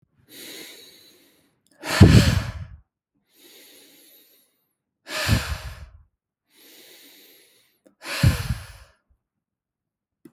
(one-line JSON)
{"exhalation_length": "10.3 s", "exhalation_amplitude": 32768, "exhalation_signal_mean_std_ratio": 0.27, "survey_phase": "beta (2021-08-13 to 2022-03-07)", "age": "18-44", "gender": "Male", "wearing_mask": "No", "symptom_none": true, "smoker_status": "Never smoked", "respiratory_condition_asthma": false, "respiratory_condition_other": false, "recruitment_source": "REACT", "submission_delay": "1 day", "covid_test_result": "Negative", "covid_test_method": "RT-qPCR", "influenza_a_test_result": "Unknown/Void", "influenza_b_test_result": "Unknown/Void"}